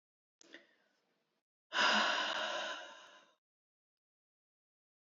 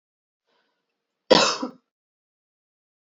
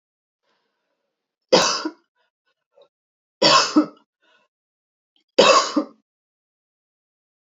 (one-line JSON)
{"exhalation_length": "5.0 s", "exhalation_amplitude": 3968, "exhalation_signal_mean_std_ratio": 0.37, "cough_length": "3.1 s", "cough_amplitude": 27355, "cough_signal_mean_std_ratio": 0.22, "three_cough_length": "7.4 s", "three_cough_amplitude": 29671, "three_cough_signal_mean_std_ratio": 0.29, "survey_phase": "beta (2021-08-13 to 2022-03-07)", "age": "45-64", "gender": "Female", "wearing_mask": "No", "symptom_cough_any": true, "symptom_shortness_of_breath": true, "symptom_fatigue": true, "symptom_other": true, "smoker_status": "Never smoked", "respiratory_condition_asthma": false, "respiratory_condition_other": false, "recruitment_source": "Test and Trace", "submission_delay": "0 days", "covid_test_result": "Negative", "covid_test_method": "LFT"}